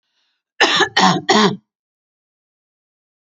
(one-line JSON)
{"cough_length": "3.3 s", "cough_amplitude": 31524, "cough_signal_mean_std_ratio": 0.38, "survey_phase": "alpha (2021-03-01 to 2021-08-12)", "age": "45-64", "gender": "Female", "wearing_mask": "No", "symptom_none": true, "smoker_status": "Ex-smoker", "respiratory_condition_asthma": true, "respiratory_condition_other": false, "recruitment_source": "REACT", "submission_delay": "1 day", "covid_test_result": "Negative", "covid_test_method": "RT-qPCR"}